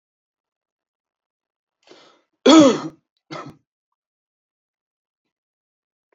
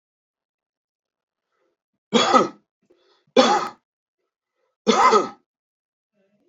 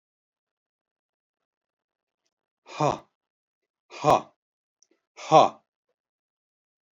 {"cough_length": "6.1 s", "cough_amplitude": 32567, "cough_signal_mean_std_ratio": 0.2, "three_cough_length": "6.5 s", "three_cough_amplitude": 25698, "three_cough_signal_mean_std_ratio": 0.31, "exhalation_length": "6.9 s", "exhalation_amplitude": 25159, "exhalation_signal_mean_std_ratio": 0.19, "survey_phase": "beta (2021-08-13 to 2022-03-07)", "age": "65+", "gender": "Male", "wearing_mask": "No", "symptom_cough_any": true, "symptom_runny_or_blocked_nose": true, "symptom_onset": "12 days", "smoker_status": "Current smoker (11 or more cigarettes per day)", "respiratory_condition_asthma": false, "respiratory_condition_other": false, "recruitment_source": "REACT", "submission_delay": "1 day", "covid_test_result": "Negative", "covid_test_method": "RT-qPCR"}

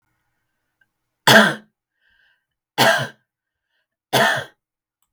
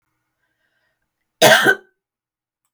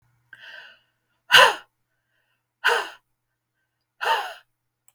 {"three_cough_length": "5.1 s", "three_cough_amplitude": 32768, "three_cough_signal_mean_std_ratio": 0.3, "cough_length": "2.7 s", "cough_amplitude": 32768, "cough_signal_mean_std_ratio": 0.27, "exhalation_length": "4.9 s", "exhalation_amplitude": 32498, "exhalation_signal_mean_std_ratio": 0.26, "survey_phase": "beta (2021-08-13 to 2022-03-07)", "age": "45-64", "gender": "Female", "wearing_mask": "No", "symptom_none": true, "smoker_status": "Never smoked", "respiratory_condition_asthma": false, "respiratory_condition_other": false, "recruitment_source": "REACT", "submission_delay": "2 days", "covid_test_result": "Negative", "covid_test_method": "RT-qPCR"}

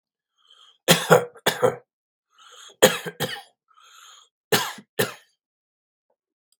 {"three_cough_length": "6.6 s", "three_cough_amplitude": 32212, "three_cough_signal_mean_std_ratio": 0.29, "survey_phase": "beta (2021-08-13 to 2022-03-07)", "age": "65+", "gender": "Male", "wearing_mask": "No", "symptom_cough_any": true, "symptom_abdominal_pain": true, "smoker_status": "Ex-smoker", "respiratory_condition_asthma": false, "respiratory_condition_other": false, "recruitment_source": "REACT", "submission_delay": "5 days", "covid_test_result": "Negative", "covid_test_method": "RT-qPCR", "influenza_a_test_result": "Negative", "influenza_b_test_result": "Negative"}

